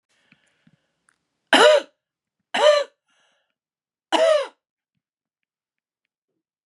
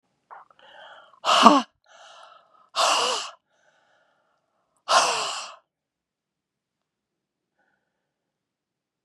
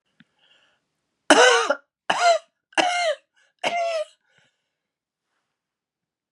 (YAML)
three_cough_length: 6.7 s
three_cough_amplitude: 31829
three_cough_signal_mean_std_ratio: 0.3
exhalation_length: 9.0 s
exhalation_amplitude: 32768
exhalation_signal_mean_std_ratio: 0.28
cough_length: 6.3 s
cough_amplitude: 32183
cough_signal_mean_std_ratio: 0.36
survey_phase: beta (2021-08-13 to 2022-03-07)
age: 65+
gender: Female
wearing_mask: 'No'
symptom_cough_any: true
symptom_runny_or_blocked_nose: true
symptom_onset: 3 days
smoker_status: Never smoked
respiratory_condition_asthma: false
respiratory_condition_other: false
recruitment_source: Test and Trace
submission_delay: 2 days
covid_test_result: Positive
covid_test_method: RT-qPCR
covid_ct_value: 22.9
covid_ct_gene: ORF1ab gene